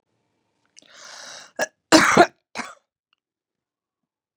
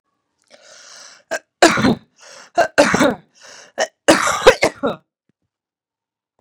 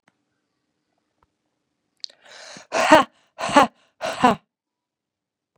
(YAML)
cough_length: 4.4 s
cough_amplitude: 32767
cough_signal_mean_std_ratio: 0.23
three_cough_length: 6.4 s
three_cough_amplitude: 32768
three_cough_signal_mean_std_ratio: 0.35
exhalation_length: 5.6 s
exhalation_amplitude: 32767
exhalation_signal_mean_std_ratio: 0.25
survey_phase: beta (2021-08-13 to 2022-03-07)
age: 45-64
gender: Female
wearing_mask: 'No'
symptom_cough_any: true
symptom_new_continuous_cough: true
symptom_sore_throat: true
symptom_fatigue: true
symptom_onset: 4 days
smoker_status: Never smoked
respiratory_condition_asthma: false
respiratory_condition_other: false
recruitment_source: Test and Trace
submission_delay: 2 days
covid_test_result: Positive
covid_test_method: ePCR